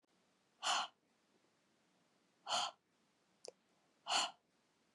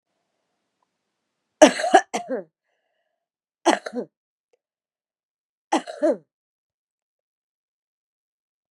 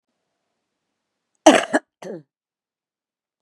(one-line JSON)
{"exhalation_length": "4.9 s", "exhalation_amplitude": 2225, "exhalation_signal_mean_std_ratio": 0.31, "three_cough_length": "8.7 s", "three_cough_amplitude": 32767, "three_cough_signal_mean_std_ratio": 0.21, "cough_length": "3.4 s", "cough_amplitude": 32768, "cough_signal_mean_std_ratio": 0.19, "survey_phase": "beta (2021-08-13 to 2022-03-07)", "age": "45-64", "gender": "Female", "wearing_mask": "No", "symptom_cough_any": true, "symptom_runny_or_blocked_nose": true, "symptom_fatigue": true, "symptom_headache": true, "symptom_onset": "3 days", "smoker_status": "Ex-smoker", "respiratory_condition_asthma": false, "respiratory_condition_other": false, "recruitment_source": "Test and Trace", "submission_delay": "1 day", "covid_test_result": "Positive", "covid_test_method": "RT-qPCR", "covid_ct_value": 21.5, "covid_ct_gene": "ORF1ab gene"}